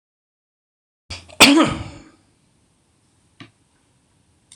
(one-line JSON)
{"cough_length": "4.6 s", "cough_amplitude": 26028, "cough_signal_mean_std_ratio": 0.24, "survey_phase": "beta (2021-08-13 to 2022-03-07)", "age": "65+", "gender": "Male", "wearing_mask": "No", "symptom_none": true, "smoker_status": "Ex-smoker", "respiratory_condition_asthma": false, "respiratory_condition_other": false, "recruitment_source": "REACT", "submission_delay": "9 days", "covid_test_result": "Negative", "covid_test_method": "RT-qPCR"}